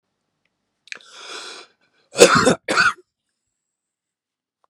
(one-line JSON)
{"cough_length": "4.7 s", "cough_amplitude": 32768, "cough_signal_mean_std_ratio": 0.28, "survey_phase": "beta (2021-08-13 to 2022-03-07)", "age": "65+", "gender": "Male", "wearing_mask": "No", "symptom_none": true, "smoker_status": "Ex-smoker", "respiratory_condition_asthma": false, "respiratory_condition_other": false, "recruitment_source": "REACT", "submission_delay": "2 days", "covid_test_result": "Negative", "covid_test_method": "RT-qPCR", "influenza_a_test_result": "Negative", "influenza_b_test_result": "Negative"}